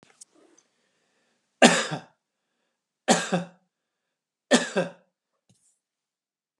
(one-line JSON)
{"three_cough_length": "6.6 s", "three_cough_amplitude": 31738, "three_cough_signal_mean_std_ratio": 0.25, "survey_phase": "alpha (2021-03-01 to 2021-08-12)", "age": "65+", "gender": "Male", "wearing_mask": "No", "symptom_none": true, "smoker_status": "Never smoked", "respiratory_condition_asthma": false, "respiratory_condition_other": false, "recruitment_source": "REACT", "submission_delay": "2 days", "covid_test_result": "Negative", "covid_test_method": "RT-qPCR"}